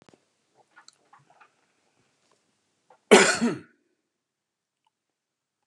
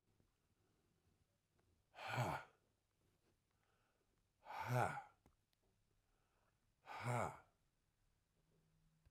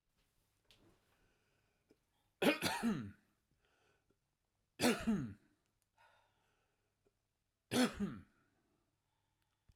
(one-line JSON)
{"cough_length": "5.7 s", "cough_amplitude": 31631, "cough_signal_mean_std_ratio": 0.19, "exhalation_length": "9.1 s", "exhalation_amplitude": 1800, "exhalation_signal_mean_std_ratio": 0.31, "three_cough_length": "9.8 s", "three_cough_amplitude": 3536, "three_cough_signal_mean_std_ratio": 0.3, "survey_phase": "beta (2021-08-13 to 2022-03-07)", "age": "65+", "gender": "Male", "wearing_mask": "No", "symptom_cough_any": true, "symptom_runny_or_blocked_nose": true, "symptom_fatigue": true, "smoker_status": "Ex-smoker", "respiratory_condition_asthma": false, "respiratory_condition_other": false, "recruitment_source": "Test and Trace", "submission_delay": "2 days", "covid_test_result": "Positive", "covid_test_method": "RT-qPCR"}